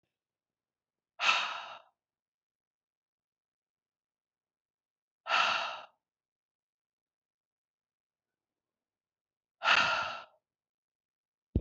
{"exhalation_length": "11.6 s", "exhalation_amplitude": 9243, "exhalation_signal_mean_std_ratio": 0.26, "survey_phase": "beta (2021-08-13 to 2022-03-07)", "age": "45-64", "gender": "Female", "wearing_mask": "No", "symptom_none": true, "smoker_status": "Ex-smoker", "respiratory_condition_asthma": false, "respiratory_condition_other": false, "recruitment_source": "REACT", "submission_delay": "1 day", "covid_test_result": "Negative", "covid_test_method": "RT-qPCR", "influenza_a_test_result": "Unknown/Void", "influenza_b_test_result": "Unknown/Void"}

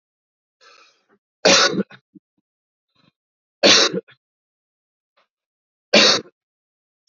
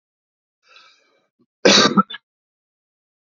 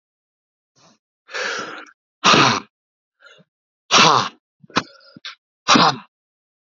{"three_cough_length": "7.1 s", "three_cough_amplitude": 32460, "three_cough_signal_mean_std_ratio": 0.28, "cough_length": "3.2 s", "cough_amplitude": 31070, "cough_signal_mean_std_ratio": 0.26, "exhalation_length": "6.7 s", "exhalation_amplitude": 32768, "exhalation_signal_mean_std_ratio": 0.34, "survey_phase": "beta (2021-08-13 to 2022-03-07)", "age": "45-64", "gender": "Male", "wearing_mask": "No", "symptom_cough_any": true, "symptom_headache": true, "symptom_other": true, "symptom_onset": "6 days", "smoker_status": "Current smoker (1 to 10 cigarettes per day)", "respiratory_condition_asthma": true, "respiratory_condition_other": false, "recruitment_source": "Test and Trace", "submission_delay": "2 days", "covid_test_result": "Positive", "covid_test_method": "RT-qPCR", "covid_ct_value": 31.1, "covid_ct_gene": "N gene"}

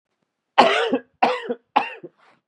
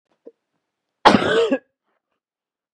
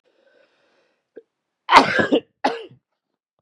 {"three_cough_length": "2.5 s", "three_cough_amplitude": 32767, "three_cough_signal_mean_std_ratio": 0.42, "cough_length": "2.7 s", "cough_amplitude": 32768, "cough_signal_mean_std_ratio": 0.31, "exhalation_length": "3.4 s", "exhalation_amplitude": 32768, "exhalation_signal_mean_std_ratio": 0.28, "survey_phase": "beta (2021-08-13 to 2022-03-07)", "age": "18-44", "gender": "Male", "wearing_mask": "No", "symptom_cough_any": true, "symptom_fatigue": true, "symptom_fever_high_temperature": true, "symptom_change_to_sense_of_smell_or_taste": true, "symptom_other": true, "symptom_onset": "2 days", "smoker_status": "Never smoked", "respiratory_condition_asthma": false, "respiratory_condition_other": false, "recruitment_source": "Test and Trace", "submission_delay": "2 days", "covid_test_result": "Positive", "covid_test_method": "RT-qPCR", "covid_ct_value": 19.5, "covid_ct_gene": "ORF1ab gene", "covid_ct_mean": 20.0, "covid_viral_load": "270000 copies/ml", "covid_viral_load_category": "Low viral load (10K-1M copies/ml)"}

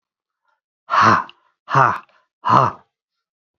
{"exhalation_length": "3.6 s", "exhalation_amplitude": 27704, "exhalation_signal_mean_std_ratio": 0.38, "survey_phase": "beta (2021-08-13 to 2022-03-07)", "age": "45-64", "gender": "Female", "wearing_mask": "No", "symptom_cough_any": true, "symptom_fatigue": true, "symptom_change_to_sense_of_smell_or_taste": true, "symptom_loss_of_taste": true, "symptom_onset": "9 days", "smoker_status": "Never smoked", "respiratory_condition_asthma": false, "respiratory_condition_other": false, "recruitment_source": "Test and Trace", "submission_delay": "1 day", "covid_test_result": "Positive", "covid_test_method": "RT-qPCR", "covid_ct_value": 22.6, "covid_ct_gene": "ORF1ab gene"}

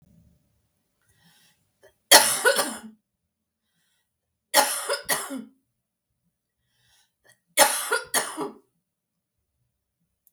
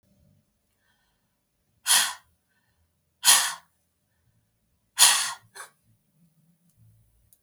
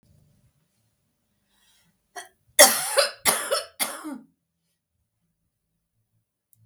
{"three_cough_length": "10.3 s", "three_cough_amplitude": 32768, "three_cough_signal_mean_std_ratio": 0.28, "exhalation_length": "7.4 s", "exhalation_amplitude": 27273, "exhalation_signal_mean_std_ratio": 0.25, "cough_length": "6.7 s", "cough_amplitude": 32768, "cough_signal_mean_std_ratio": 0.25, "survey_phase": "beta (2021-08-13 to 2022-03-07)", "age": "45-64", "gender": "Female", "wearing_mask": "No", "symptom_cough_any": true, "smoker_status": "Never smoked", "respiratory_condition_asthma": false, "respiratory_condition_other": false, "recruitment_source": "REACT", "submission_delay": "2 days", "covid_test_result": "Negative", "covid_test_method": "RT-qPCR", "influenza_a_test_result": "Negative", "influenza_b_test_result": "Negative"}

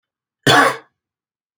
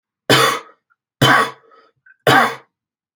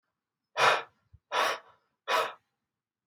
{"cough_length": "1.6 s", "cough_amplitude": 31549, "cough_signal_mean_std_ratio": 0.34, "three_cough_length": "3.2 s", "three_cough_amplitude": 31940, "three_cough_signal_mean_std_ratio": 0.42, "exhalation_length": "3.1 s", "exhalation_amplitude": 9528, "exhalation_signal_mean_std_ratio": 0.38, "survey_phase": "alpha (2021-03-01 to 2021-08-12)", "age": "18-44", "gender": "Male", "wearing_mask": "No", "symptom_headache": true, "symptom_onset": "5 days", "smoker_status": "Never smoked", "respiratory_condition_asthma": false, "respiratory_condition_other": false, "recruitment_source": "REACT", "submission_delay": "2 days", "covid_test_result": "Negative", "covid_test_method": "RT-qPCR"}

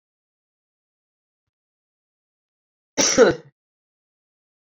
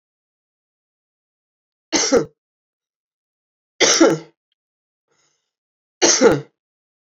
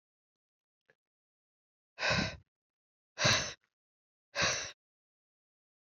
{"cough_length": "4.8 s", "cough_amplitude": 25490, "cough_signal_mean_std_ratio": 0.2, "three_cough_length": "7.1 s", "three_cough_amplitude": 32373, "three_cough_signal_mean_std_ratio": 0.3, "exhalation_length": "5.8 s", "exhalation_amplitude": 6055, "exhalation_signal_mean_std_ratio": 0.31, "survey_phase": "beta (2021-08-13 to 2022-03-07)", "age": "45-64", "gender": "Female", "wearing_mask": "No", "symptom_cough_any": true, "symptom_runny_or_blocked_nose": true, "symptom_fatigue": true, "symptom_onset": "4 days", "smoker_status": "Ex-smoker", "respiratory_condition_asthma": false, "respiratory_condition_other": false, "recruitment_source": "Test and Trace", "submission_delay": "2 days", "covid_test_result": "Positive", "covid_test_method": "RT-qPCR"}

